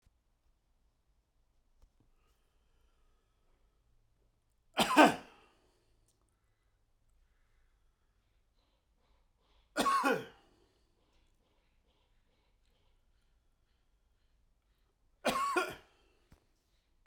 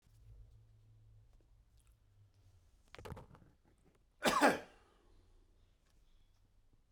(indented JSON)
{
  "three_cough_length": "17.1 s",
  "three_cough_amplitude": 10853,
  "three_cough_signal_mean_std_ratio": 0.2,
  "cough_length": "6.9 s",
  "cough_amplitude": 4603,
  "cough_signal_mean_std_ratio": 0.23,
  "survey_phase": "beta (2021-08-13 to 2022-03-07)",
  "age": "65+",
  "gender": "Male",
  "wearing_mask": "No",
  "symptom_cough_any": true,
  "symptom_shortness_of_breath": true,
  "symptom_onset": "6 days",
  "smoker_status": "Never smoked",
  "respiratory_condition_asthma": true,
  "respiratory_condition_other": false,
  "recruitment_source": "Test and Trace",
  "submission_delay": "1 day",
  "covid_test_result": "Positive",
  "covid_test_method": "RT-qPCR",
  "covid_ct_value": 14.3,
  "covid_ct_gene": "S gene",
  "covid_ct_mean": 14.6,
  "covid_viral_load": "16000000 copies/ml",
  "covid_viral_load_category": "High viral load (>1M copies/ml)"
}